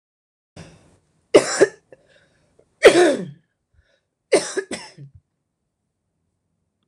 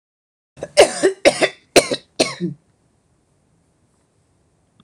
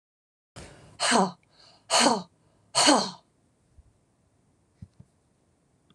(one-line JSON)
{"three_cough_length": "6.9 s", "three_cough_amplitude": 26028, "three_cough_signal_mean_std_ratio": 0.26, "cough_length": "4.8 s", "cough_amplitude": 26028, "cough_signal_mean_std_ratio": 0.29, "exhalation_length": "5.9 s", "exhalation_amplitude": 17543, "exhalation_signal_mean_std_ratio": 0.32, "survey_phase": "beta (2021-08-13 to 2022-03-07)", "age": "45-64", "gender": "Female", "wearing_mask": "No", "symptom_none": true, "smoker_status": "Never smoked", "respiratory_condition_asthma": true, "respiratory_condition_other": false, "recruitment_source": "Test and Trace", "submission_delay": "2 days", "covid_test_result": "Negative", "covid_test_method": "RT-qPCR"}